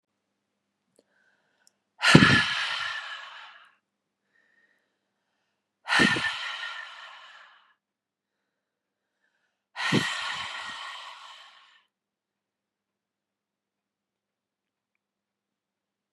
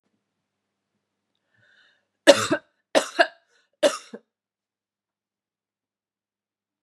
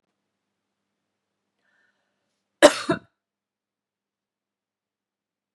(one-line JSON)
{"exhalation_length": "16.1 s", "exhalation_amplitude": 32767, "exhalation_signal_mean_std_ratio": 0.27, "three_cough_length": "6.8 s", "three_cough_amplitude": 32767, "three_cough_signal_mean_std_ratio": 0.19, "cough_length": "5.5 s", "cough_amplitude": 32767, "cough_signal_mean_std_ratio": 0.12, "survey_phase": "beta (2021-08-13 to 2022-03-07)", "age": "45-64", "gender": "Female", "wearing_mask": "No", "symptom_runny_or_blocked_nose": true, "smoker_status": "Never smoked", "respiratory_condition_asthma": false, "respiratory_condition_other": false, "recruitment_source": "REACT", "submission_delay": "1 day", "covid_test_result": "Negative", "covid_test_method": "RT-qPCR", "influenza_a_test_result": "Negative", "influenza_b_test_result": "Negative"}